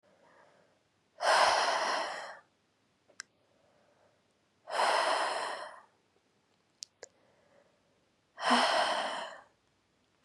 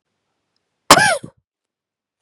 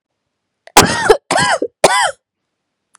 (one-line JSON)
{"exhalation_length": "10.2 s", "exhalation_amplitude": 7300, "exhalation_signal_mean_std_ratio": 0.43, "cough_length": "2.2 s", "cough_amplitude": 32768, "cough_signal_mean_std_ratio": 0.25, "three_cough_length": "3.0 s", "three_cough_amplitude": 32768, "three_cough_signal_mean_std_ratio": 0.43, "survey_phase": "beta (2021-08-13 to 2022-03-07)", "age": "18-44", "gender": "Female", "wearing_mask": "No", "symptom_runny_or_blocked_nose": true, "symptom_sore_throat": true, "symptom_diarrhoea": true, "symptom_headache": true, "smoker_status": "Never smoked", "respiratory_condition_asthma": false, "respiratory_condition_other": false, "recruitment_source": "Test and Trace", "submission_delay": "2 days", "covid_test_result": "Positive", "covid_test_method": "RT-qPCR"}